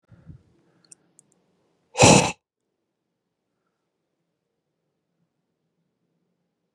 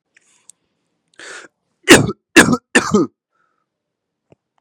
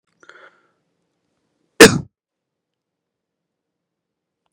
{
  "exhalation_length": "6.7 s",
  "exhalation_amplitude": 32141,
  "exhalation_signal_mean_std_ratio": 0.17,
  "three_cough_length": "4.6 s",
  "three_cough_amplitude": 32768,
  "three_cough_signal_mean_std_ratio": 0.28,
  "cough_length": "4.5 s",
  "cough_amplitude": 32768,
  "cough_signal_mean_std_ratio": 0.14,
  "survey_phase": "beta (2021-08-13 to 2022-03-07)",
  "age": "18-44",
  "gender": "Male",
  "wearing_mask": "No",
  "symptom_cough_any": true,
  "symptom_runny_or_blocked_nose": true,
  "symptom_sore_throat": true,
  "symptom_onset": "4 days",
  "smoker_status": "Ex-smoker",
  "respiratory_condition_asthma": false,
  "respiratory_condition_other": false,
  "recruitment_source": "Test and Trace",
  "submission_delay": "1 day",
  "covid_test_result": "Positive",
  "covid_test_method": "RT-qPCR",
  "covid_ct_value": 23.2,
  "covid_ct_gene": "N gene"
}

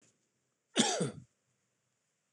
{
  "cough_length": "2.3 s",
  "cough_amplitude": 7969,
  "cough_signal_mean_std_ratio": 0.3,
  "survey_phase": "beta (2021-08-13 to 2022-03-07)",
  "age": "65+",
  "gender": "Male",
  "wearing_mask": "No",
  "symptom_none": true,
  "smoker_status": "Never smoked",
  "respiratory_condition_asthma": false,
  "respiratory_condition_other": false,
  "recruitment_source": "REACT",
  "submission_delay": "2 days",
  "covid_test_result": "Negative",
  "covid_test_method": "RT-qPCR",
  "influenza_a_test_result": "Negative",
  "influenza_b_test_result": "Negative"
}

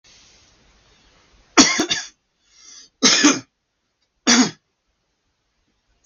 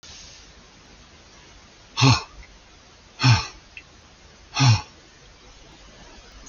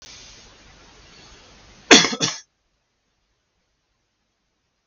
{
  "three_cough_length": "6.1 s",
  "three_cough_amplitude": 32768,
  "three_cough_signal_mean_std_ratio": 0.31,
  "exhalation_length": "6.5 s",
  "exhalation_amplitude": 22325,
  "exhalation_signal_mean_std_ratio": 0.32,
  "cough_length": "4.9 s",
  "cough_amplitude": 32768,
  "cough_signal_mean_std_ratio": 0.2,
  "survey_phase": "beta (2021-08-13 to 2022-03-07)",
  "age": "65+",
  "gender": "Male",
  "wearing_mask": "No",
  "symptom_none": true,
  "smoker_status": "Never smoked",
  "respiratory_condition_asthma": false,
  "respiratory_condition_other": false,
  "recruitment_source": "REACT",
  "submission_delay": "8 days",
  "covid_test_result": "Negative",
  "covid_test_method": "RT-qPCR",
  "influenza_a_test_result": "Negative",
  "influenza_b_test_result": "Negative"
}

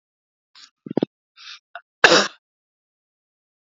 {
  "cough_length": "3.7 s",
  "cough_amplitude": 32767,
  "cough_signal_mean_std_ratio": 0.2,
  "survey_phase": "alpha (2021-03-01 to 2021-08-12)",
  "age": "45-64",
  "gender": "Male",
  "wearing_mask": "No",
  "symptom_none": true,
  "smoker_status": "Ex-smoker",
  "respiratory_condition_asthma": false,
  "respiratory_condition_other": false,
  "recruitment_source": "REACT",
  "submission_delay": "1 day",
  "covid_test_result": "Negative",
  "covid_test_method": "RT-qPCR"
}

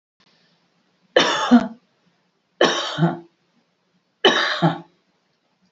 {
  "three_cough_length": "5.7 s",
  "three_cough_amplitude": 31884,
  "three_cough_signal_mean_std_ratio": 0.37,
  "survey_phase": "beta (2021-08-13 to 2022-03-07)",
  "age": "65+",
  "gender": "Female",
  "wearing_mask": "No",
  "symptom_none": true,
  "smoker_status": "Ex-smoker",
  "respiratory_condition_asthma": false,
  "respiratory_condition_other": false,
  "recruitment_source": "REACT",
  "submission_delay": "0 days",
  "covid_test_result": "Negative",
  "covid_test_method": "RT-qPCR",
  "influenza_a_test_result": "Negative",
  "influenza_b_test_result": "Negative"
}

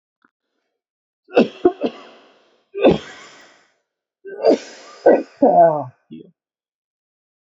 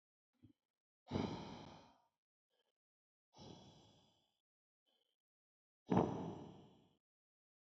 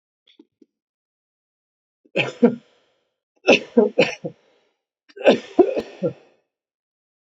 {
  "cough_length": "7.4 s",
  "cough_amplitude": 30293,
  "cough_signal_mean_std_ratio": 0.33,
  "exhalation_length": "7.7 s",
  "exhalation_amplitude": 3693,
  "exhalation_signal_mean_std_ratio": 0.26,
  "three_cough_length": "7.3 s",
  "three_cough_amplitude": 27555,
  "three_cough_signal_mean_std_ratio": 0.28,
  "survey_phase": "beta (2021-08-13 to 2022-03-07)",
  "age": "18-44",
  "gender": "Male",
  "wearing_mask": "No",
  "symptom_cough_any": true,
  "symptom_new_continuous_cough": true,
  "symptom_runny_or_blocked_nose": true,
  "symptom_sore_throat": true,
  "symptom_fatigue": true,
  "symptom_fever_high_temperature": true,
  "symptom_headache": true,
  "symptom_onset": "3 days",
  "smoker_status": "Never smoked",
  "respiratory_condition_asthma": false,
  "respiratory_condition_other": false,
  "recruitment_source": "Test and Trace",
  "submission_delay": "0 days",
  "covid_test_result": "Positive",
  "covid_test_method": "ePCR"
}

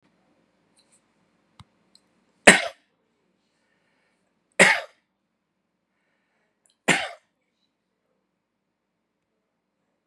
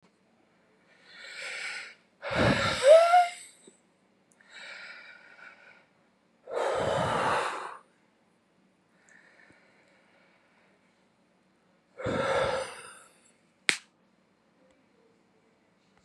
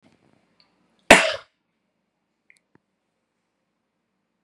{
  "three_cough_length": "10.1 s",
  "three_cough_amplitude": 32768,
  "three_cough_signal_mean_std_ratio": 0.16,
  "exhalation_length": "16.0 s",
  "exhalation_amplitude": 24628,
  "exhalation_signal_mean_std_ratio": 0.33,
  "cough_length": "4.4 s",
  "cough_amplitude": 32768,
  "cough_signal_mean_std_ratio": 0.15,
  "survey_phase": "beta (2021-08-13 to 2022-03-07)",
  "age": "65+",
  "gender": "Male",
  "wearing_mask": "No",
  "symptom_none": true,
  "smoker_status": "Never smoked",
  "respiratory_condition_asthma": false,
  "respiratory_condition_other": false,
  "recruitment_source": "REACT",
  "submission_delay": "2 days",
  "covid_test_result": "Negative",
  "covid_test_method": "RT-qPCR"
}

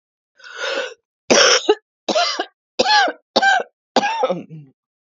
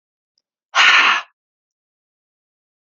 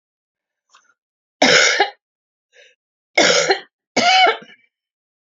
{
  "cough_length": "5.0 s",
  "cough_amplitude": 32649,
  "cough_signal_mean_std_ratio": 0.5,
  "exhalation_length": "3.0 s",
  "exhalation_amplitude": 29397,
  "exhalation_signal_mean_std_ratio": 0.32,
  "three_cough_length": "5.3 s",
  "three_cough_amplitude": 32767,
  "three_cough_signal_mean_std_ratio": 0.4,
  "survey_phase": "beta (2021-08-13 to 2022-03-07)",
  "age": "65+",
  "gender": "Female",
  "wearing_mask": "No",
  "symptom_cough_any": true,
  "symptom_runny_or_blocked_nose": true,
  "symptom_shortness_of_breath": true,
  "symptom_sore_throat": true,
  "symptom_fatigue": true,
  "symptom_fever_high_temperature": true,
  "symptom_headache": true,
  "symptom_change_to_sense_of_smell_or_taste": true,
  "symptom_onset": "2 days",
  "smoker_status": "Ex-smoker",
  "respiratory_condition_asthma": false,
  "respiratory_condition_other": false,
  "recruitment_source": "Test and Trace",
  "submission_delay": "1 day",
  "covid_test_result": "Positive",
  "covid_test_method": "RT-qPCR"
}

